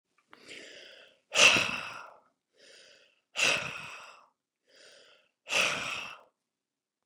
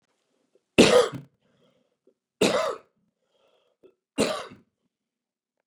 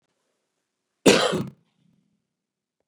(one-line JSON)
{"exhalation_length": "7.1 s", "exhalation_amplitude": 17056, "exhalation_signal_mean_std_ratio": 0.33, "three_cough_length": "5.7 s", "three_cough_amplitude": 24126, "three_cough_signal_mean_std_ratio": 0.27, "cough_length": "2.9 s", "cough_amplitude": 26457, "cough_signal_mean_std_ratio": 0.25, "survey_phase": "beta (2021-08-13 to 2022-03-07)", "age": "45-64", "gender": "Male", "wearing_mask": "No", "symptom_none": true, "smoker_status": "Never smoked", "respiratory_condition_asthma": false, "respiratory_condition_other": false, "recruitment_source": "REACT", "submission_delay": "3 days", "covid_test_result": "Negative", "covid_test_method": "RT-qPCR", "influenza_a_test_result": "Unknown/Void", "influenza_b_test_result": "Unknown/Void"}